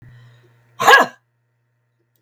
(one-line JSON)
{"exhalation_length": "2.2 s", "exhalation_amplitude": 32768, "exhalation_signal_mean_std_ratio": 0.27, "survey_phase": "beta (2021-08-13 to 2022-03-07)", "age": "65+", "gender": "Female", "wearing_mask": "No", "symptom_cough_any": true, "symptom_runny_or_blocked_nose": true, "symptom_sore_throat": true, "symptom_headache": true, "symptom_onset": "11 days", "smoker_status": "Current smoker (e-cigarettes or vapes only)", "respiratory_condition_asthma": false, "respiratory_condition_other": true, "recruitment_source": "REACT", "submission_delay": "7 days", "covid_test_result": "Negative", "covid_test_method": "RT-qPCR", "influenza_a_test_result": "Negative", "influenza_b_test_result": "Negative"}